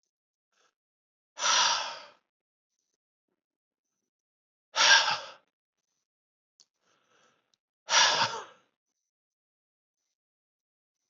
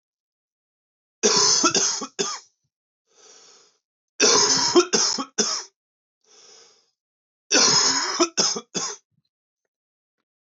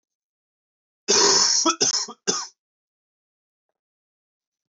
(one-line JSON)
{"exhalation_length": "11.1 s", "exhalation_amplitude": 16008, "exhalation_signal_mean_std_ratio": 0.27, "three_cough_length": "10.4 s", "three_cough_amplitude": 20202, "three_cough_signal_mean_std_ratio": 0.45, "cough_length": "4.7 s", "cough_amplitude": 16096, "cough_signal_mean_std_ratio": 0.38, "survey_phase": "beta (2021-08-13 to 2022-03-07)", "age": "45-64", "gender": "Male", "wearing_mask": "No", "symptom_runny_or_blocked_nose": true, "symptom_abdominal_pain": true, "symptom_fatigue": true, "symptom_fever_high_temperature": true, "symptom_other": true, "smoker_status": "Ex-smoker", "respiratory_condition_asthma": false, "respiratory_condition_other": false, "recruitment_source": "Test and Trace", "submission_delay": "2 days", "covid_test_result": "Positive", "covid_test_method": "RT-qPCR"}